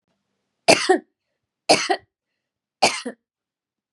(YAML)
three_cough_length: 3.9 s
three_cough_amplitude: 32768
three_cough_signal_mean_std_ratio: 0.29
survey_phase: beta (2021-08-13 to 2022-03-07)
age: 45-64
gender: Female
wearing_mask: 'No'
symptom_none: true
smoker_status: Never smoked
respiratory_condition_asthma: false
respiratory_condition_other: false
recruitment_source: REACT
submission_delay: 2 days
covid_test_result: Negative
covid_test_method: RT-qPCR